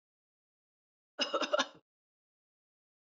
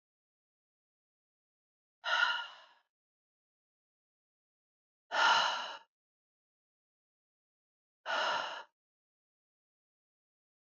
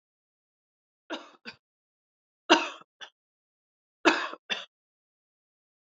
{"cough_length": "3.2 s", "cough_amplitude": 5698, "cough_signal_mean_std_ratio": 0.25, "exhalation_length": "10.8 s", "exhalation_amplitude": 5561, "exhalation_signal_mean_std_ratio": 0.28, "three_cough_length": "6.0 s", "three_cough_amplitude": 19699, "three_cough_signal_mean_std_ratio": 0.2, "survey_phase": "alpha (2021-03-01 to 2021-08-12)", "age": "45-64", "gender": "Female", "wearing_mask": "No", "symptom_none": true, "smoker_status": "Never smoked", "respiratory_condition_asthma": false, "respiratory_condition_other": false, "recruitment_source": "REACT", "submission_delay": "2 days", "covid_test_result": "Negative", "covid_test_method": "RT-qPCR"}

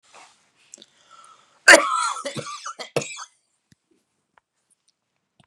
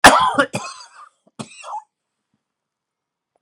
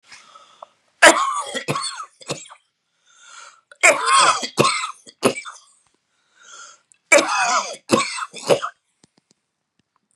{"cough_length": "5.5 s", "cough_amplitude": 32768, "cough_signal_mean_std_ratio": 0.23, "exhalation_length": "3.4 s", "exhalation_amplitude": 32768, "exhalation_signal_mean_std_ratio": 0.28, "three_cough_length": "10.2 s", "three_cough_amplitude": 32768, "three_cough_signal_mean_std_ratio": 0.39, "survey_phase": "beta (2021-08-13 to 2022-03-07)", "age": "65+", "gender": "Male", "wearing_mask": "No", "symptom_none": true, "smoker_status": "Ex-smoker", "respiratory_condition_asthma": false, "respiratory_condition_other": false, "recruitment_source": "REACT", "submission_delay": "5 days", "covid_test_result": "Negative", "covid_test_method": "RT-qPCR", "influenza_a_test_result": "Negative", "influenza_b_test_result": "Negative"}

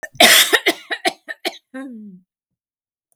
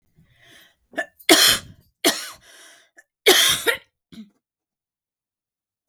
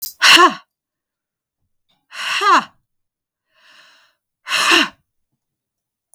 {"cough_length": "3.2 s", "cough_amplitude": 32768, "cough_signal_mean_std_ratio": 0.36, "three_cough_length": "5.9 s", "three_cough_amplitude": 32768, "three_cough_signal_mean_std_ratio": 0.31, "exhalation_length": "6.1 s", "exhalation_amplitude": 32768, "exhalation_signal_mean_std_ratio": 0.33, "survey_phase": "beta (2021-08-13 to 2022-03-07)", "age": "45-64", "gender": "Female", "wearing_mask": "No", "symptom_none": true, "smoker_status": "Never smoked", "respiratory_condition_asthma": false, "respiratory_condition_other": false, "recruitment_source": "REACT", "submission_delay": "5 days", "covid_test_result": "Negative", "covid_test_method": "RT-qPCR", "influenza_a_test_result": "Negative", "influenza_b_test_result": "Negative"}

